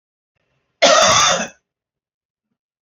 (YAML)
cough_length: 2.8 s
cough_amplitude: 30946
cough_signal_mean_std_ratio: 0.39
survey_phase: alpha (2021-03-01 to 2021-08-12)
age: 45-64
gender: Male
wearing_mask: 'No'
symptom_none: true
smoker_status: Ex-smoker
respiratory_condition_asthma: false
respiratory_condition_other: false
recruitment_source: REACT
submission_delay: 10 days
covid_test_result: Negative
covid_test_method: RT-qPCR